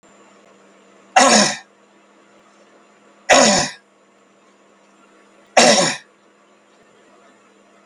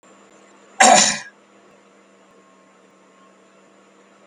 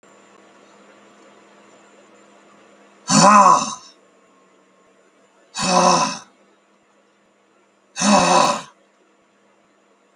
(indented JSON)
{
  "three_cough_length": "7.9 s",
  "three_cough_amplitude": 32768,
  "three_cough_signal_mean_std_ratio": 0.32,
  "cough_length": "4.3 s",
  "cough_amplitude": 32768,
  "cough_signal_mean_std_ratio": 0.25,
  "exhalation_length": "10.2 s",
  "exhalation_amplitude": 32766,
  "exhalation_signal_mean_std_ratio": 0.34,
  "survey_phase": "beta (2021-08-13 to 2022-03-07)",
  "age": "65+",
  "gender": "Male",
  "wearing_mask": "No",
  "symptom_none": true,
  "smoker_status": "Ex-smoker",
  "respiratory_condition_asthma": false,
  "respiratory_condition_other": false,
  "recruitment_source": "REACT",
  "submission_delay": "3 days",
  "covid_test_result": "Negative",
  "covid_test_method": "RT-qPCR",
  "influenza_a_test_result": "Negative",
  "influenza_b_test_result": "Negative"
}